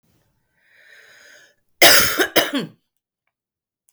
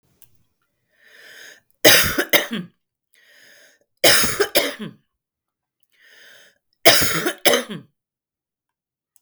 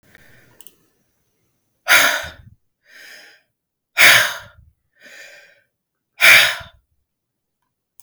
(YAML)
cough_length: 3.9 s
cough_amplitude: 32768
cough_signal_mean_std_ratio: 0.31
three_cough_length: 9.2 s
three_cough_amplitude: 32768
three_cough_signal_mean_std_ratio: 0.33
exhalation_length: 8.0 s
exhalation_amplitude: 32768
exhalation_signal_mean_std_ratio: 0.29
survey_phase: beta (2021-08-13 to 2022-03-07)
age: 45-64
gender: Female
wearing_mask: 'No'
symptom_none: true
smoker_status: Current smoker (1 to 10 cigarettes per day)
respiratory_condition_asthma: false
respiratory_condition_other: false
recruitment_source: REACT
submission_delay: 1 day
covid_test_result: Negative
covid_test_method: RT-qPCR
influenza_a_test_result: Negative
influenza_b_test_result: Negative